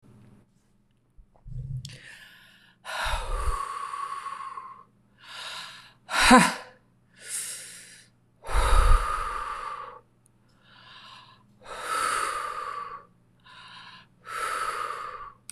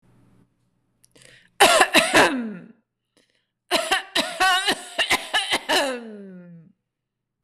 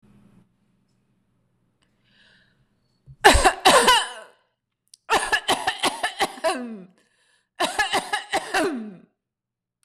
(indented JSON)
{
  "exhalation_length": "15.5 s",
  "exhalation_amplitude": 22045,
  "exhalation_signal_mean_std_ratio": 0.42,
  "cough_length": "7.4 s",
  "cough_amplitude": 25949,
  "cough_signal_mean_std_ratio": 0.46,
  "three_cough_length": "9.8 s",
  "three_cough_amplitude": 26028,
  "three_cough_signal_mean_std_ratio": 0.4,
  "survey_phase": "beta (2021-08-13 to 2022-03-07)",
  "age": "45-64",
  "gender": "Female",
  "wearing_mask": "No",
  "symptom_none": true,
  "smoker_status": "Never smoked",
  "respiratory_condition_asthma": false,
  "respiratory_condition_other": false,
  "recruitment_source": "REACT",
  "submission_delay": "1 day",
  "covid_test_result": "Negative",
  "covid_test_method": "RT-qPCR"
}